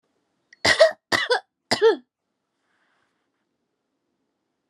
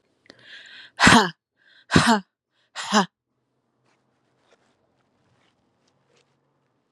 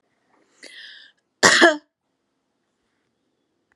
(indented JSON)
{
  "three_cough_length": "4.7 s",
  "three_cough_amplitude": 28046,
  "three_cough_signal_mean_std_ratio": 0.29,
  "exhalation_length": "6.9 s",
  "exhalation_amplitude": 32573,
  "exhalation_signal_mean_std_ratio": 0.25,
  "cough_length": "3.8 s",
  "cough_amplitude": 32298,
  "cough_signal_mean_std_ratio": 0.24,
  "survey_phase": "alpha (2021-03-01 to 2021-08-12)",
  "age": "18-44",
  "gender": "Female",
  "wearing_mask": "No",
  "symptom_none": true,
  "smoker_status": "Never smoked",
  "respiratory_condition_asthma": false,
  "respiratory_condition_other": false,
  "recruitment_source": "REACT",
  "submission_delay": "2 days",
  "covid_test_result": "Negative",
  "covid_test_method": "RT-qPCR"
}